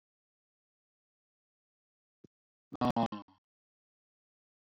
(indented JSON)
{
  "exhalation_length": "4.8 s",
  "exhalation_amplitude": 4800,
  "exhalation_signal_mean_std_ratio": 0.18,
  "survey_phase": "beta (2021-08-13 to 2022-03-07)",
  "age": "65+",
  "gender": "Male",
  "wearing_mask": "No",
  "symptom_none": true,
  "smoker_status": "Never smoked",
  "respiratory_condition_asthma": true,
  "respiratory_condition_other": false,
  "recruitment_source": "REACT",
  "submission_delay": "1 day",
  "covid_test_result": "Negative",
  "covid_test_method": "RT-qPCR",
  "influenza_a_test_result": "Negative",
  "influenza_b_test_result": "Negative"
}